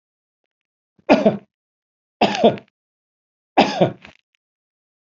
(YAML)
three_cough_length: 5.1 s
three_cough_amplitude: 27907
three_cough_signal_mean_std_ratio: 0.29
survey_phase: beta (2021-08-13 to 2022-03-07)
age: 65+
gender: Male
wearing_mask: 'No'
symptom_sore_throat: true
symptom_headache: true
symptom_onset: 12 days
smoker_status: Never smoked
respiratory_condition_asthma: false
respiratory_condition_other: false
recruitment_source: REACT
submission_delay: 4 days
covid_test_result: Negative
covid_test_method: RT-qPCR
influenza_a_test_result: Negative
influenza_b_test_result: Negative